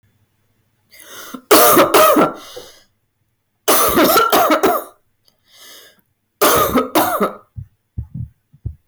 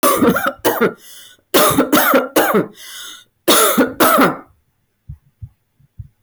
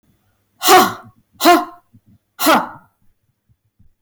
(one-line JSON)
{"three_cough_length": "8.9 s", "three_cough_amplitude": 32641, "three_cough_signal_mean_std_ratio": 0.52, "cough_length": "6.2 s", "cough_amplitude": 26332, "cough_signal_mean_std_ratio": 0.59, "exhalation_length": "4.0 s", "exhalation_amplitude": 30644, "exhalation_signal_mean_std_ratio": 0.37, "survey_phase": "beta (2021-08-13 to 2022-03-07)", "age": "45-64", "gender": "Female", "wearing_mask": "No", "symptom_none": true, "smoker_status": "Never smoked", "respiratory_condition_asthma": false, "respiratory_condition_other": false, "recruitment_source": "REACT", "submission_delay": "1 day", "covid_test_result": "Negative", "covid_test_method": "RT-qPCR"}